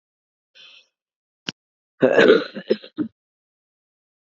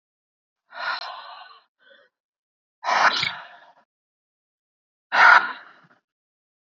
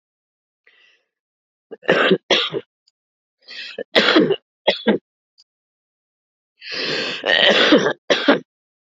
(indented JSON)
{
  "cough_length": "4.4 s",
  "cough_amplitude": 28301,
  "cough_signal_mean_std_ratio": 0.27,
  "exhalation_length": "6.7 s",
  "exhalation_amplitude": 29894,
  "exhalation_signal_mean_std_ratio": 0.28,
  "three_cough_length": "9.0 s",
  "three_cough_amplitude": 32768,
  "three_cough_signal_mean_std_ratio": 0.42,
  "survey_phase": "beta (2021-08-13 to 2022-03-07)",
  "age": "45-64",
  "gender": "Female",
  "wearing_mask": "Yes",
  "symptom_cough_any": true,
  "symptom_runny_or_blocked_nose": true,
  "symptom_sore_throat": true,
  "symptom_fatigue": true,
  "symptom_headache": true,
  "symptom_loss_of_taste": true,
  "symptom_other": true,
  "symptom_onset": "3 days",
  "smoker_status": "Never smoked",
  "respiratory_condition_asthma": false,
  "respiratory_condition_other": false,
  "recruitment_source": "Test and Trace",
  "submission_delay": "2 days",
  "covid_test_result": "Positive",
  "covid_test_method": "RT-qPCR",
  "covid_ct_value": 28.8,
  "covid_ct_gene": "N gene"
}